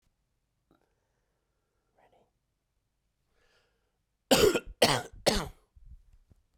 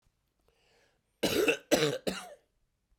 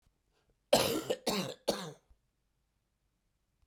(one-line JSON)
{"exhalation_length": "6.6 s", "exhalation_amplitude": 15736, "exhalation_signal_mean_std_ratio": 0.25, "three_cough_length": "3.0 s", "three_cough_amplitude": 11466, "three_cough_signal_mean_std_ratio": 0.39, "cough_length": "3.7 s", "cough_amplitude": 8057, "cough_signal_mean_std_ratio": 0.34, "survey_phase": "beta (2021-08-13 to 2022-03-07)", "age": "45-64", "gender": "Female", "wearing_mask": "No", "symptom_cough_any": true, "symptom_runny_or_blocked_nose": true, "symptom_fatigue": true, "symptom_fever_high_temperature": true, "symptom_headache": true, "symptom_change_to_sense_of_smell_or_taste": true, "symptom_loss_of_taste": true, "symptom_onset": "5 days", "smoker_status": "Never smoked", "respiratory_condition_asthma": false, "respiratory_condition_other": false, "recruitment_source": "Test and Trace", "submission_delay": "1 day", "covid_test_result": "Positive", "covid_test_method": "RT-qPCR"}